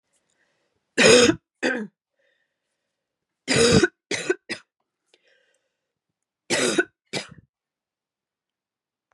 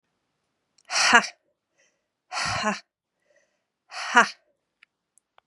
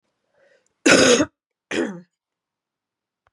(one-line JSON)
{"three_cough_length": "9.1 s", "three_cough_amplitude": 26378, "three_cough_signal_mean_std_ratio": 0.3, "exhalation_length": "5.5 s", "exhalation_amplitude": 31413, "exhalation_signal_mean_std_ratio": 0.28, "cough_length": "3.3 s", "cough_amplitude": 31187, "cough_signal_mean_std_ratio": 0.32, "survey_phase": "beta (2021-08-13 to 2022-03-07)", "age": "18-44", "gender": "Female", "wearing_mask": "No", "symptom_runny_or_blocked_nose": true, "symptom_fatigue": true, "symptom_other": true, "symptom_onset": "3 days", "smoker_status": "Never smoked", "respiratory_condition_asthma": false, "respiratory_condition_other": false, "recruitment_source": "Test and Trace", "submission_delay": "2 days", "covid_test_result": "Positive", "covid_test_method": "RT-qPCR", "covid_ct_value": 20.2, "covid_ct_gene": "ORF1ab gene", "covid_ct_mean": 20.9, "covid_viral_load": "140000 copies/ml", "covid_viral_load_category": "Low viral load (10K-1M copies/ml)"}